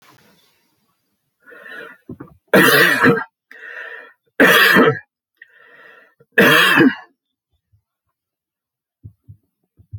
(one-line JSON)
{"three_cough_length": "10.0 s", "three_cough_amplitude": 32200, "three_cough_signal_mean_std_ratio": 0.37, "survey_phase": "alpha (2021-03-01 to 2021-08-12)", "age": "65+", "gender": "Male", "wearing_mask": "No", "symptom_none": true, "symptom_onset": "12 days", "smoker_status": "Ex-smoker", "respiratory_condition_asthma": true, "respiratory_condition_other": false, "recruitment_source": "REACT", "submission_delay": "3 days", "covid_test_result": "Negative", "covid_test_method": "RT-qPCR"}